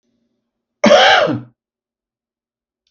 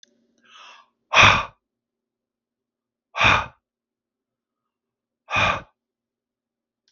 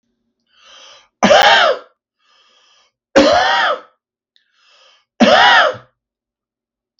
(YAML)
cough_length: 2.9 s
cough_amplitude: 32768
cough_signal_mean_std_ratio: 0.35
exhalation_length: 6.9 s
exhalation_amplitude: 32768
exhalation_signal_mean_std_ratio: 0.26
three_cough_length: 7.0 s
three_cough_amplitude: 32768
three_cough_signal_mean_std_ratio: 0.42
survey_phase: beta (2021-08-13 to 2022-03-07)
age: 45-64
gender: Male
wearing_mask: 'No'
symptom_none: true
smoker_status: Never smoked
respiratory_condition_asthma: false
respiratory_condition_other: false
recruitment_source: REACT
submission_delay: 2 days
covid_test_result: Negative
covid_test_method: RT-qPCR
influenza_a_test_result: Negative
influenza_b_test_result: Negative